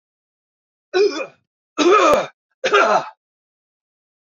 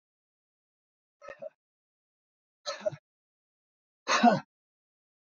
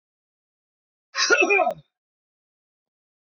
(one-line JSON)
{"three_cough_length": "4.4 s", "three_cough_amplitude": 26285, "three_cough_signal_mean_std_ratio": 0.42, "exhalation_length": "5.4 s", "exhalation_amplitude": 10195, "exhalation_signal_mean_std_ratio": 0.21, "cough_length": "3.3 s", "cough_amplitude": 17905, "cough_signal_mean_std_ratio": 0.32, "survey_phase": "beta (2021-08-13 to 2022-03-07)", "age": "65+", "gender": "Male", "wearing_mask": "No", "symptom_none": true, "smoker_status": "Ex-smoker", "respiratory_condition_asthma": false, "respiratory_condition_other": false, "recruitment_source": "REACT", "submission_delay": "2 days", "covid_test_result": "Negative", "covid_test_method": "RT-qPCR", "influenza_a_test_result": "Negative", "influenza_b_test_result": "Negative"}